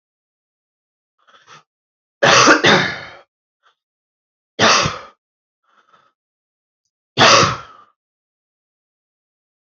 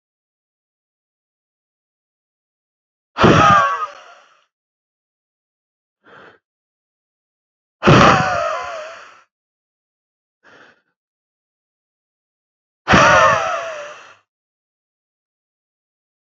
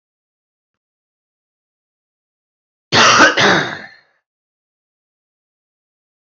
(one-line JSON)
{"three_cough_length": "9.6 s", "three_cough_amplitude": 32131, "three_cough_signal_mean_std_ratio": 0.31, "exhalation_length": "16.4 s", "exhalation_amplitude": 30526, "exhalation_signal_mean_std_ratio": 0.29, "cough_length": "6.3 s", "cough_amplitude": 30997, "cough_signal_mean_std_ratio": 0.28, "survey_phase": "beta (2021-08-13 to 2022-03-07)", "age": "18-44", "gender": "Male", "wearing_mask": "No", "symptom_cough_any": true, "symptom_runny_or_blocked_nose": true, "symptom_fever_high_temperature": true, "symptom_headache": true, "smoker_status": "Never smoked", "respiratory_condition_asthma": false, "respiratory_condition_other": false, "recruitment_source": "Test and Trace", "submission_delay": "2 days", "covid_test_result": "Positive", "covid_test_method": "LFT"}